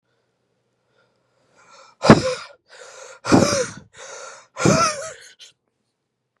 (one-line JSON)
{"exhalation_length": "6.4 s", "exhalation_amplitude": 32768, "exhalation_signal_mean_std_ratio": 0.31, "survey_phase": "beta (2021-08-13 to 2022-03-07)", "age": "18-44", "gender": "Male", "wearing_mask": "No", "symptom_cough_any": true, "symptom_shortness_of_breath": true, "symptom_diarrhoea": true, "symptom_fever_high_temperature": true, "symptom_change_to_sense_of_smell_or_taste": true, "symptom_onset": "4 days", "smoker_status": "Never smoked", "respiratory_condition_asthma": false, "respiratory_condition_other": false, "recruitment_source": "Test and Trace", "submission_delay": "1 day", "covid_test_result": "Positive", "covid_test_method": "RT-qPCR"}